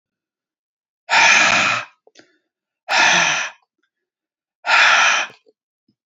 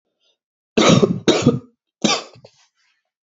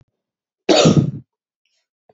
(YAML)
exhalation_length: 6.1 s
exhalation_amplitude: 29784
exhalation_signal_mean_std_ratio: 0.47
three_cough_length: 3.2 s
three_cough_amplitude: 29727
three_cough_signal_mean_std_ratio: 0.39
cough_length: 2.1 s
cough_amplitude: 28950
cough_signal_mean_std_ratio: 0.36
survey_phase: beta (2021-08-13 to 2022-03-07)
age: 18-44
gender: Male
wearing_mask: 'No'
symptom_cough_any: true
symptom_runny_or_blocked_nose: true
symptom_sore_throat: true
symptom_fever_high_temperature: true
symptom_onset: 4 days
smoker_status: Never smoked
respiratory_condition_asthma: false
respiratory_condition_other: false
recruitment_source: Test and Trace
submission_delay: 2 days
covid_test_result: Positive
covid_test_method: ePCR